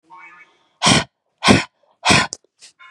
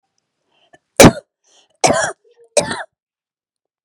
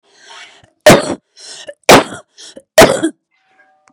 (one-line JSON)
{"exhalation_length": "2.9 s", "exhalation_amplitude": 32768, "exhalation_signal_mean_std_ratio": 0.37, "cough_length": "3.8 s", "cough_amplitude": 32768, "cough_signal_mean_std_ratio": 0.26, "three_cough_length": "3.9 s", "three_cough_amplitude": 32768, "three_cough_signal_mean_std_ratio": 0.35, "survey_phase": "beta (2021-08-13 to 2022-03-07)", "age": "18-44", "gender": "Female", "wearing_mask": "No", "symptom_fatigue": true, "smoker_status": "Never smoked", "respiratory_condition_asthma": false, "respiratory_condition_other": false, "recruitment_source": "REACT", "submission_delay": "1 day", "covid_test_result": "Negative", "covid_test_method": "RT-qPCR", "influenza_a_test_result": "Negative", "influenza_b_test_result": "Negative"}